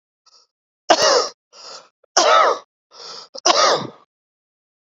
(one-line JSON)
{"three_cough_length": "4.9 s", "three_cough_amplitude": 32767, "three_cough_signal_mean_std_ratio": 0.41, "survey_phase": "beta (2021-08-13 to 2022-03-07)", "age": "18-44", "gender": "Male", "wearing_mask": "No", "symptom_cough_any": true, "symptom_fatigue": true, "symptom_headache": true, "symptom_change_to_sense_of_smell_or_taste": true, "smoker_status": "Current smoker (1 to 10 cigarettes per day)", "respiratory_condition_asthma": false, "respiratory_condition_other": false, "recruitment_source": "Test and Trace", "submission_delay": "3 days", "covid_test_result": "Positive", "covid_test_method": "RT-qPCR", "covid_ct_value": 18.3, "covid_ct_gene": "ORF1ab gene", "covid_ct_mean": 18.9, "covid_viral_load": "630000 copies/ml", "covid_viral_load_category": "Low viral load (10K-1M copies/ml)"}